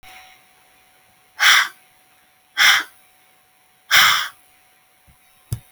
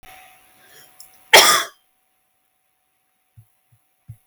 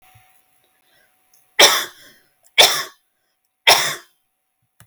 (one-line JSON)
{"exhalation_length": "5.7 s", "exhalation_amplitude": 32767, "exhalation_signal_mean_std_ratio": 0.33, "cough_length": "4.3 s", "cough_amplitude": 32768, "cough_signal_mean_std_ratio": 0.22, "three_cough_length": "4.9 s", "three_cough_amplitude": 32256, "three_cough_signal_mean_std_ratio": 0.29, "survey_phase": "alpha (2021-03-01 to 2021-08-12)", "age": "18-44", "gender": "Female", "wearing_mask": "No", "symptom_none": true, "smoker_status": "Never smoked", "respiratory_condition_asthma": false, "respiratory_condition_other": false, "recruitment_source": "REACT", "submission_delay": "1 day", "covid_test_result": "Negative", "covid_test_method": "RT-qPCR"}